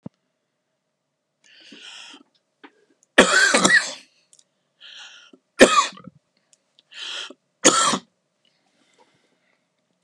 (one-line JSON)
{"three_cough_length": "10.0 s", "three_cough_amplitude": 32768, "three_cough_signal_mean_std_ratio": 0.28, "survey_phase": "beta (2021-08-13 to 2022-03-07)", "age": "65+", "gender": "Male", "wearing_mask": "No", "symptom_cough_any": true, "smoker_status": "Ex-smoker", "respiratory_condition_asthma": false, "respiratory_condition_other": false, "recruitment_source": "REACT", "submission_delay": "1 day", "covid_test_result": "Negative", "covid_test_method": "RT-qPCR"}